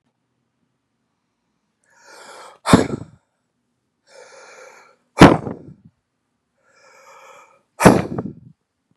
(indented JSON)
{
  "exhalation_length": "9.0 s",
  "exhalation_amplitude": 32768,
  "exhalation_signal_mean_std_ratio": 0.21,
  "survey_phase": "beta (2021-08-13 to 2022-03-07)",
  "age": "45-64",
  "gender": "Male",
  "wearing_mask": "No",
  "symptom_cough_any": true,
  "symptom_new_continuous_cough": true,
  "symptom_runny_or_blocked_nose": true,
  "symptom_fever_high_temperature": true,
  "symptom_headache": true,
  "symptom_onset": "4 days",
  "smoker_status": "Never smoked",
  "respiratory_condition_asthma": true,
  "respiratory_condition_other": false,
  "recruitment_source": "Test and Trace",
  "submission_delay": "2 days",
  "covid_test_result": "Positive",
  "covid_test_method": "RT-qPCR",
  "covid_ct_value": 24.1,
  "covid_ct_gene": "ORF1ab gene",
  "covid_ct_mean": 24.7,
  "covid_viral_load": "8000 copies/ml",
  "covid_viral_load_category": "Minimal viral load (< 10K copies/ml)"
}